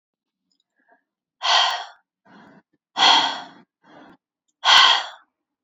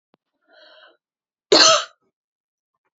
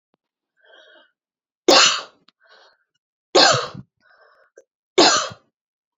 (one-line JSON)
{"exhalation_length": "5.6 s", "exhalation_amplitude": 28318, "exhalation_signal_mean_std_ratio": 0.36, "cough_length": "3.0 s", "cough_amplitude": 30353, "cough_signal_mean_std_ratio": 0.26, "three_cough_length": "6.0 s", "three_cough_amplitude": 29908, "three_cough_signal_mean_std_ratio": 0.31, "survey_phase": "beta (2021-08-13 to 2022-03-07)", "age": "18-44", "gender": "Female", "wearing_mask": "No", "symptom_cough_any": true, "symptom_runny_or_blocked_nose": true, "symptom_abdominal_pain": true, "symptom_fatigue": true, "symptom_onset": "3 days", "smoker_status": "Never smoked", "respiratory_condition_asthma": false, "respiratory_condition_other": false, "recruitment_source": "Test and Trace", "submission_delay": "2 days", "covid_test_result": "Positive", "covid_test_method": "RT-qPCR", "covid_ct_value": 33.4, "covid_ct_gene": "N gene"}